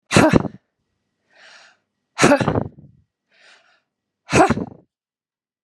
{"exhalation_length": "5.6 s", "exhalation_amplitude": 32768, "exhalation_signal_mean_std_ratio": 0.32, "survey_phase": "beta (2021-08-13 to 2022-03-07)", "age": "45-64", "gender": "Female", "wearing_mask": "No", "symptom_cough_any": true, "symptom_runny_or_blocked_nose": true, "symptom_fatigue": true, "symptom_onset": "2 days", "smoker_status": "Never smoked", "respiratory_condition_asthma": false, "respiratory_condition_other": false, "recruitment_source": "Test and Trace", "submission_delay": "1 day", "covid_test_result": "Negative", "covid_test_method": "ePCR"}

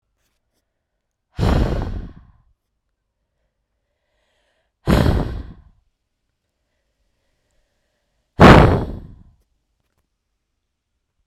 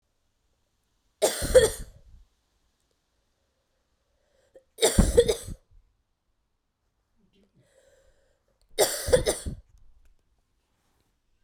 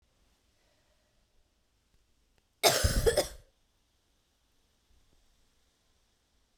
{"exhalation_length": "11.3 s", "exhalation_amplitude": 32768, "exhalation_signal_mean_std_ratio": 0.26, "three_cough_length": "11.4 s", "three_cough_amplitude": 22428, "three_cough_signal_mean_std_ratio": 0.26, "cough_length": "6.6 s", "cough_amplitude": 12085, "cough_signal_mean_std_ratio": 0.24, "survey_phase": "beta (2021-08-13 to 2022-03-07)", "age": "18-44", "gender": "Female", "wearing_mask": "No", "symptom_cough_any": true, "symptom_new_continuous_cough": true, "symptom_runny_or_blocked_nose": true, "symptom_shortness_of_breath": true, "symptom_sore_throat": true, "symptom_abdominal_pain": true, "symptom_fatigue": true, "symptom_headache": true, "smoker_status": "Never smoked", "respiratory_condition_asthma": false, "respiratory_condition_other": false, "recruitment_source": "Test and Trace", "submission_delay": "2 days", "covid_test_result": "Positive", "covid_test_method": "RT-qPCR", "covid_ct_value": 19.4, "covid_ct_gene": "ORF1ab gene", "covid_ct_mean": 20.1, "covid_viral_load": "260000 copies/ml", "covid_viral_load_category": "Low viral load (10K-1M copies/ml)"}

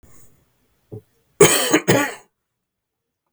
{"cough_length": "3.3 s", "cough_amplitude": 32768, "cough_signal_mean_std_ratio": 0.32, "survey_phase": "beta (2021-08-13 to 2022-03-07)", "age": "65+", "gender": "Male", "wearing_mask": "No", "symptom_cough_any": true, "symptom_shortness_of_breath": true, "symptom_onset": "12 days", "smoker_status": "Ex-smoker", "respiratory_condition_asthma": false, "respiratory_condition_other": false, "recruitment_source": "REACT", "submission_delay": "1 day", "covid_test_result": "Negative", "covid_test_method": "RT-qPCR", "influenza_a_test_result": "Positive", "influenza_a_ct_value": 34.8, "influenza_b_test_result": "Positive", "influenza_b_ct_value": 35.9}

